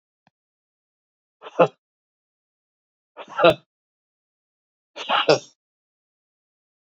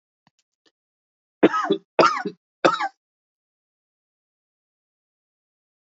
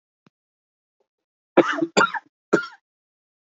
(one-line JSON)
{"exhalation_length": "7.0 s", "exhalation_amplitude": 28306, "exhalation_signal_mean_std_ratio": 0.2, "three_cough_length": "5.8 s", "three_cough_amplitude": 27064, "three_cough_signal_mean_std_ratio": 0.25, "cough_length": "3.6 s", "cough_amplitude": 25745, "cough_signal_mean_std_ratio": 0.27, "survey_phase": "beta (2021-08-13 to 2022-03-07)", "age": "65+", "gender": "Male", "wearing_mask": "No", "symptom_cough_any": true, "symptom_fever_high_temperature": true, "symptom_headache": true, "symptom_onset": "3 days", "smoker_status": "Ex-smoker", "respiratory_condition_asthma": false, "respiratory_condition_other": false, "recruitment_source": "Test and Trace", "submission_delay": "2 days", "covid_test_result": "Positive", "covid_test_method": "RT-qPCR", "covid_ct_value": 19.5, "covid_ct_gene": "ORF1ab gene"}